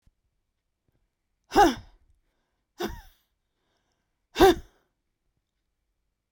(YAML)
exhalation_length: 6.3 s
exhalation_amplitude: 20200
exhalation_signal_mean_std_ratio: 0.21
survey_phase: beta (2021-08-13 to 2022-03-07)
age: 45-64
gender: Female
wearing_mask: 'No'
symptom_new_continuous_cough: true
symptom_runny_or_blocked_nose: true
symptom_fatigue: true
symptom_headache: true
smoker_status: Never smoked
respiratory_condition_asthma: true
respiratory_condition_other: false
recruitment_source: Test and Trace
submission_delay: 2 days
covid_test_result: Positive
covid_test_method: RT-qPCR
covid_ct_value: 16.2
covid_ct_gene: ORF1ab gene
covid_ct_mean: 16.4
covid_viral_load: 4100000 copies/ml
covid_viral_load_category: High viral load (>1M copies/ml)